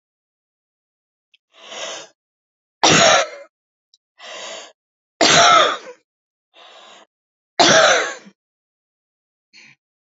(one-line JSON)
{"three_cough_length": "10.1 s", "three_cough_amplitude": 32768, "three_cough_signal_mean_std_ratio": 0.34, "survey_phase": "alpha (2021-03-01 to 2021-08-12)", "age": "65+", "gender": "Female", "wearing_mask": "No", "symptom_none": true, "smoker_status": "Never smoked", "respiratory_condition_asthma": false, "respiratory_condition_other": false, "recruitment_source": "REACT", "submission_delay": "1 day", "covid_test_result": "Negative", "covid_test_method": "RT-qPCR"}